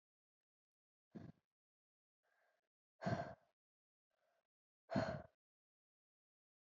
{
  "exhalation_length": "6.7 s",
  "exhalation_amplitude": 1559,
  "exhalation_signal_mean_std_ratio": 0.23,
  "survey_phase": "beta (2021-08-13 to 2022-03-07)",
  "age": "18-44",
  "gender": "Female",
  "wearing_mask": "No",
  "symptom_cough_any": true,
  "symptom_sore_throat": true,
  "symptom_onset": "12 days",
  "smoker_status": "Never smoked",
  "respiratory_condition_asthma": false,
  "respiratory_condition_other": false,
  "recruitment_source": "REACT",
  "submission_delay": "1 day",
  "covid_test_result": "Negative",
  "covid_test_method": "RT-qPCR",
  "influenza_a_test_result": "Negative",
  "influenza_b_test_result": "Negative"
}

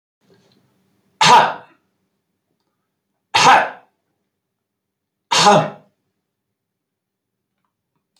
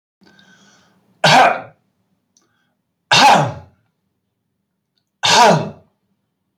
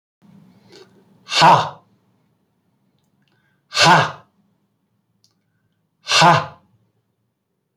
{
  "three_cough_length": "8.2 s",
  "three_cough_amplitude": 29573,
  "three_cough_signal_mean_std_ratio": 0.28,
  "cough_length": "6.6 s",
  "cough_amplitude": 30315,
  "cough_signal_mean_std_ratio": 0.36,
  "exhalation_length": "7.8 s",
  "exhalation_amplitude": 29284,
  "exhalation_signal_mean_std_ratio": 0.29,
  "survey_phase": "beta (2021-08-13 to 2022-03-07)",
  "age": "45-64",
  "gender": "Male",
  "wearing_mask": "No",
  "symptom_none": true,
  "smoker_status": "Never smoked",
  "respiratory_condition_asthma": false,
  "respiratory_condition_other": false,
  "recruitment_source": "REACT",
  "submission_delay": "1 day",
  "covid_test_result": "Negative",
  "covid_test_method": "RT-qPCR"
}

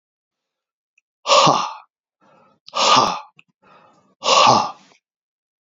{
  "exhalation_length": "5.6 s",
  "exhalation_amplitude": 28466,
  "exhalation_signal_mean_std_ratio": 0.38,
  "survey_phase": "beta (2021-08-13 to 2022-03-07)",
  "age": "45-64",
  "gender": "Male",
  "wearing_mask": "No",
  "symptom_cough_any": true,
  "symptom_runny_or_blocked_nose": true,
  "symptom_headache": true,
  "symptom_onset": "2 days",
  "smoker_status": "Current smoker (1 to 10 cigarettes per day)",
  "respiratory_condition_asthma": false,
  "respiratory_condition_other": false,
  "recruitment_source": "Test and Trace",
  "submission_delay": "2 days",
  "covid_test_result": "Positive",
  "covid_test_method": "RT-qPCR",
  "covid_ct_value": 15.5,
  "covid_ct_gene": "ORF1ab gene",
  "covid_ct_mean": 16.5,
  "covid_viral_load": "3800000 copies/ml",
  "covid_viral_load_category": "High viral load (>1M copies/ml)"
}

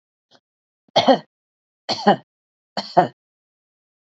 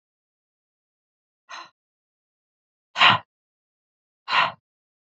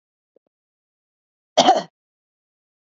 {
  "three_cough_length": "4.2 s",
  "three_cough_amplitude": 27073,
  "three_cough_signal_mean_std_ratio": 0.27,
  "exhalation_length": "5.0 s",
  "exhalation_amplitude": 26799,
  "exhalation_signal_mean_std_ratio": 0.22,
  "cough_length": "2.9 s",
  "cough_amplitude": 29911,
  "cough_signal_mean_std_ratio": 0.21,
  "survey_phase": "beta (2021-08-13 to 2022-03-07)",
  "age": "45-64",
  "gender": "Female",
  "wearing_mask": "No",
  "symptom_diarrhoea": true,
  "symptom_fatigue": true,
  "smoker_status": "Never smoked",
  "respiratory_condition_asthma": false,
  "respiratory_condition_other": false,
  "recruitment_source": "Test and Trace",
  "submission_delay": "2 days",
  "covid_test_result": "Positive",
  "covid_test_method": "LAMP"
}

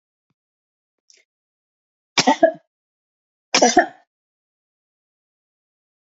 {
  "cough_length": "6.1 s",
  "cough_amplitude": 30060,
  "cough_signal_mean_std_ratio": 0.22,
  "survey_phase": "beta (2021-08-13 to 2022-03-07)",
  "age": "45-64",
  "gender": "Female",
  "wearing_mask": "No",
  "symptom_fatigue": true,
  "symptom_headache": true,
  "smoker_status": "Never smoked",
  "respiratory_condition_asthma": false,
  "respiratory_condition_other": false,
  "recruitment_source": "REACT",
  "submission_delay": "2 days",
  "covid_test_result": "Negative",
  "covid_test_method": "RT-qPCR",
  "influenza_a_test_result": "Negative",
  "influenza_b_test_result": "Negative"
}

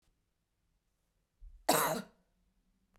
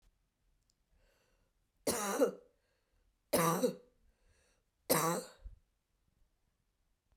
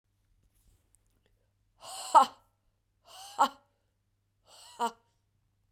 {
  "cough_length": "3.0 s",
  "cough_amplitude": 6047,
  "cough_signal_mean_std_ratio": 0.27,
  "three_cough_length": "7.2 s",
  "three_cough_amplitude": 5416,
  "three_cough_signal_mean_std_ratio": 0.32,
  "exhalation_length": "5.7 s",
  "exhalation_amplitude": 13481,
  "exhalation_signal_mean_std_ratio": 0.19,
  "survey_phase": "beta (2021-08-13 to 2022-03-07)",
  "age": "45-64",
  "gender": "Female",
  "wearing_mask": "No",
  "symptom_runny_or_blocked_nose": true,
  "symptom_fatigue": true,
  "smoker_status": "Never smoked",
  "respiratory_condition_asthma": false,
  "respiratory_condition_other": false,
  "recruitment_source": "Test and Trace",
  "submission_delay": "3 days",
  "covid_test_result": "Positive",
  "covid_test_method": "RT-qPCR",
  "covid_ct_value": 26.5,
  "covid_ct_gene": "ORF1ab gene",
  "covid_ct_mean": 27.5,
  "covid_viral_load": "990 copies/ml",
  "covid_viral_load_category": "Minimal viral load (< 10K copies/ml)"
}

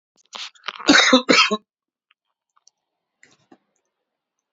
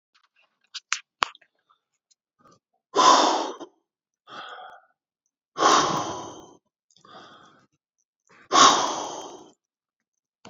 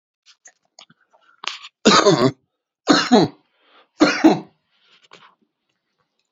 {
  "cough_length": "4.5 s",
  "cough_amplitude": 28864,
  "cough_signal_mean_std_ratio": 0.29,
  "exhalation_length": "10.5 s",
  "exhalation_amplitude": 32767,
  "exhalation_signal_mean_std_ratio": 0.31,
  "three_cough_length": "6.3 s",
  "three_cough_amplitude": 31514,
  "three_cough_signal_mean_std_ratio": 0.33,
  "survey_phase": "beta (2021-08-13 to 2022-03-07)",
  "age": "45-64",
  "gender": "Male",
  "wearing_mask": "No",
  "symptom_cough_any": true,
  "symptom_runny_or_blocked_nose": true,
  "symptom_fatigue": true,
  "symptom_headache": true,
  "symptom_change_to_sense_of_smell_or_taste": true,
  "symptom_loss_of_taste": true,
  "symptom_onset": "5 days",
  "smoker_status": "Ex-smoker",
  "respiratory_condition_asthma": false,
  "respiratory_condition_other": false,
  "recruitment_source": "Test and Trace",
  "submission_delay": "2 days",
  "covid_test_result": "Positive",
  "covid_test_method": "RT-qPCR",
  "covid_ct_value": 21.4,
  "covid_ct_gene": "ORF1ab gene"
}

